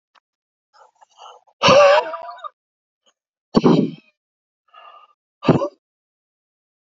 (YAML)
exhalation_length: 7.0 s
exhalation_amplitude: 29735
exhalation_signal_mean_std_ratio: 0.3
survey_phase: alpha (2021-03-01 to 2021-08-12)
age: 45-64
gender: Male
wearing_mask: 'No'
symptom_none: true
smoker_status: Ex-smoker
respiratory_condition_asthma: false
respiratory_condition_other: false
recruitment_source: REACT
submission_delay: 2 days
covid_test_result: Negative
covid_test_method: RT-qPCR